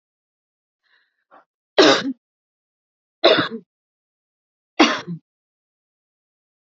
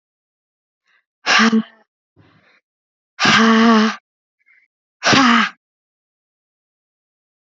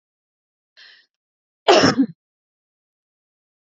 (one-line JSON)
{"three_cough_length": "6.7 s", "three_cough_amplitude": 31153, "three_cough_signal_mean_std_ratio": 0.25, "exhalation_length": "7.6 s", "exhalation_amplitude": 30102, "exhalation_signal_mean_std_ratio": 0.38, "cough_length": "3.8 s", "cough_amplitude": 28457, "cough_signal_mean_std_ratio": 0.24, "survey_phase": "alpha (2021-03-01 to 2021-08-12)", "age": "45-64", "gender": "Female", "wearing_mask": "No", "symptom_none": true, "smoker_status": "Never smoked", "respiratory_condition_asthma": false, "respiratory_condition_other": false, "recruitment_source": "REACT", "submission_delay": "3 days", "covid_test_result": "Negative", "covid_test_method": "RT-qPCR"}